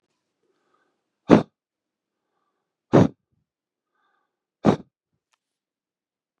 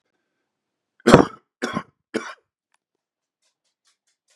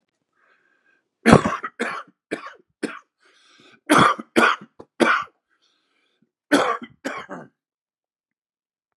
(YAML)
exhalation_length: 6.4 s
exhalation_amplitude: 32768
exhalation_signal_mean_std_ratio: 0.17
three_cough_length: 4.4 s
three_cough_amplitude: 32768
three_cough_signal_mean_std_ratio: 0.18
cough_length: 9.0 s
cough_amplitude: 32768
cough_signal_mean_std_ratio: 0.31
survey_phase: beta (2021-08-13 to 2022-03-07)
age: 18-44
gender: Male
wearing_mask: 'No'
symptom_cough_any: true
symptom_runny_or_blocked_nose: true
symptom_sore_throat: true
symptom_diarrhoea: true
symptom_fatigue: true
symptom_fever_high_temperature: true
symptom_headache: true
symptom_change_to_sense_of_smell_or_taste: true
symptom_loss_of_taste: true
symptom_onset: 3 days
smoker_status: Ex-smoker
respiratory_condition_asthma: false
respiratory_condition_other: false
recruitment_source: Test and Trace
submission_delay: 2 days
covid_test_result: Positive
covid_test_method: ePCR